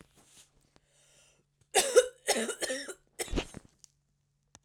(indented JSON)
{
  "three_cough_length": "4.6 s",
  "three_cough_amplitude": 12840,
  "three_cough_signal_mean_std_ratio": 0.31,
  "survey_phase": "beta (2021-08-13 to 2022-03-07)",
  "age": "45-64",
  "gender": "Female",
  "wearing_mask": "No",
  "symptom_none": true,
  "smoker_status": "Ex-smoker",
  "respiratory_condition_asthma": false,
  "respiratory_condition_other": false,
  "recruitment_source": "REACT",
  "submission_delay": "3 days",
  "covid_test_result": "Negative",
  "covid_test_method": "RT-qPCR",
  "influenza_a_test_result": "Negative",
  "influenza_b_test_result": "Negative"
}